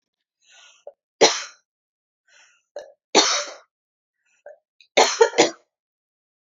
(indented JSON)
{
  "three_cough_length": "6.5 s",
  "three_cough_amplitude": 29090,
  "three_cough_signal_mean_std_ratio": 0.27,
  "survey_phase": "beta (2021-08-13 to 2022-03-07)",
  "age": "18-44",
  "gender": "Female",
  "wearing_mask": "No",
  "symptom_cough_any": true,
  "symptom_new_continuous_cough": true,
  "symptom_shortness_of_breath": true,
  "symptom_sore_throat": true,
  "symptom_fatigue": true,
  "symptom_headache": true,
  "symptom_onset": "3 days",
  "smoker_status": "Never smoked",
  "respiratory_condition_asthma": false,
  "respiratory_condition_other": false,
  "recruitment_source": "Test and Trace",
  "submission_delay": "2 days",
  "covid_test_result": "Positive",
  "covid_test_method": "RT-qPCR",
  "covid_ct_value": 26.6,
  "covid_ct_gene": "ORF1ab gene"
}